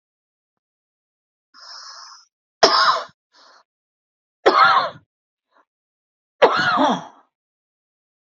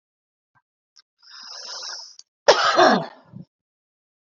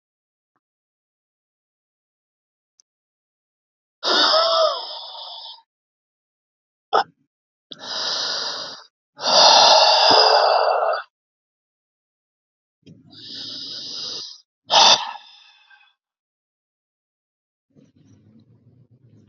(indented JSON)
{
  "three_cough_length": "8.4 s",
  "three_cough_amplitude": 32768,
  "three_cough_signal_mean_std_ratio": 0.32,
  "cough_length": "4.3 s",
  "cough_amplitude": 30018,
  "cough_signal_mean_std_ratio": 0.31,
  "exhalation_length": "19.3 s",
  "exhalation_amplitude": 29815,
  "exhalation_signal_mean_std_ratio": 0.36,
  "survey_phase": "beta (2021-08-13 to 2022-03-07)",
  "age": "45-64",
  "gender": "Male",
  "wearing_mask": "No",
  "symptom_none": true,
  "symptom_onset": "12 days",
  "smoker_status": "Never smoked",
  "respiratory_condition_asthma": true,
  "respiratory_condition_other": false,
  "recruitment_source": "REACT",
  "submission_delay": "7 days",
  "covid_test_result": "Negative",
  "covid_test_method": "RT-qPCR",
  "influenza_a_test_result": "Negative",
  "influenza_b_test_result": "Negative"
}